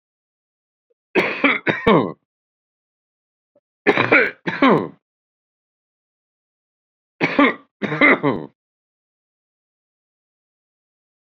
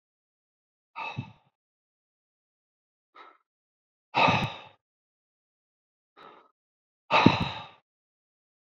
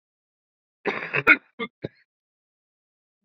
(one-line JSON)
{"three_cough_length": "11.3 s", "three_cough_amplitude": 32767, "three_cough_signal_mean_std_ratio": 0.32, "exhalation_length": "8.8 s", "exhalation_amplitude": 26397, "exhalation_signal_mean_std_ratio": 0.23, "cough_length": "3.2 s", "cough_amplitude": 25535, "cough_signal_mean_std_ratio": 0.22, "survey_phase": "beta (2021-08-13 to 2022-03-07)", "age": "45-64", "gender": "Male", "wearing_mask": "No", "symptom_runny_or_blocked_nose": true, "symptom_sore_throat": true, "symptom_onset": "12 days", "smoker_status": "Ex-smoker", "respiratory_condition_asthma": false, "respiratory_condition_other": false, "recruitment_source": "REACT", "submission_delay": "3 days", "covid_test_result": "Negative", "covid_test_method": "RT-qPCR", "influenza_a_test_result": "Negative", "influenza_b_test_result": "Negative"}